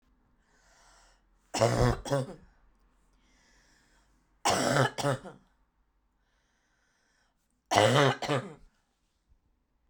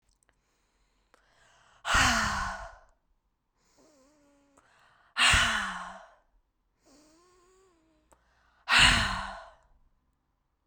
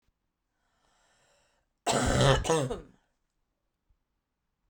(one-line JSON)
{"three_cough_length": "9.9 s", "three_cough_amplitude": 16441, "three_cough_signal_mean_std_ratio": 0.35, "exhalation_length": "10.7 s", "exhalation_amplitude": 16430, "exhalation_signal_mean_std_ratio": 0.33, "cough_length": "4.7 s", "cough_amplitude": 11059, "cough_signal_mean_std_ratio": 0.34, "survey_phase": "alpha (2021-03-01 to 2021-08-12)", "age": "18-44", "gender": "Female", "wearing_mask": "No", "symptom_cough_any": true, "symptom_shortness_of_breath": true, "symptom_fatigue": true, "symptom_headache": true, "symptom_change_to_sense_of_smell_or_taste": true, "symptom_onset": "2 days", "smoker_status": "Never smoked", "respiratory_condition_asthma": false, "respiratory_condition_other": false, "recruitment_source": "Test and Trace", "submission_delay": "1 day", "covid_test_result": "Positive", "covid_test_method": "RT-qPCR", "covid_ct_value": 22.6, "covid_ct_gene": "ORF1ab gene"}